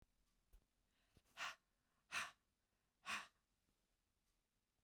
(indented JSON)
{
  "exhalation_length": "4.8 s",
  "exhalation_amplitude": 760,
  "exhalation_signal_mean_std_ratio": 0.28,
  "survey_phase": "beta (2021-08-13 to 2022-03-07)",
  "age": "45-64",
  "gender": "Female",
  "wearing_mask": "No",
  "symptom_cough_any": true,
  "symptom_runny_or_blocked_nose": true,
  "symptom_shortness_of_breath": true,
  "symptom_sore_throat": true,
  "symptom_fatigue": true,
  "symptom_headache": true,
  "symptom_onset": "2 days",
  "smoker_status": "Never smoked",
  "respiratory_condition_asthma": false,
  "respiratory_condition_other": false,
  "recruitment_source": "Test and Trace",
  "submission_delay": "2 days",
  "covid_test_result": "Positive",
  "covid_test_method": "RT-qPCR",
  "covid_ct_value": 21.3,
  "covid_ct_gene": "ORF1ab gene",
  "covid_ct_mean": 22.4,
  "covid_viral_load": "46000 copies/ml",
  "covid_viral_load_category": "Low viral load (10K-1M copies/ml)"
}